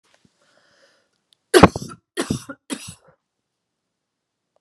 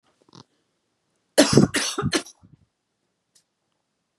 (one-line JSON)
{"three_cough_length": "4.6 s", "three_cough_amplitude": 32768, "three_cough_signal_mean_std_ratio": 0.18, "cough_length": "4.2 s", "cough_amplitude": 32767, "cough_signal_mean_std_ratio": 0.27, "survey_phase": "beta (2021-08-13 to 2022-03-07)", "age": "18-44", "gender": "Female", "wearing_mask": "No", "symptom_none": true, "smoker_status": "Never smoked", "respiratory_condition_asthma": false, "respiratory_condition_other": false, "recruitment_source": "REACT", "submission_delay": "1 day", "covid_test_result": "Negative", "covid_test_method": "RT-qPCR", "influenza_a_test_result": "Unknown/Void", "influenza_b_test_result": "Unknown/Void"}